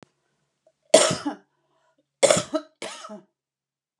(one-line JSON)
{"three_cough_length": "4.0 s", "three_cough_amplitude": 31928, "three_cough_signal_mean_std_ratio": 0.28, "survey_phase": "beta (2021-08-13 to 2022-03-07)", "age": "45-64", "gender": "Female", "wearing_mask": "No", "symptom_none": true, "smoker_status": "Current smoker (e-cigarettes or vapes only)", "respiratory_condition_asthma": false, "respiratory_condition_other": false, "recruitment_source": "REACT", "submission_delay": "2 days", "covid_test_result": "Negative", "covid_test_method": "RT-qPCR"}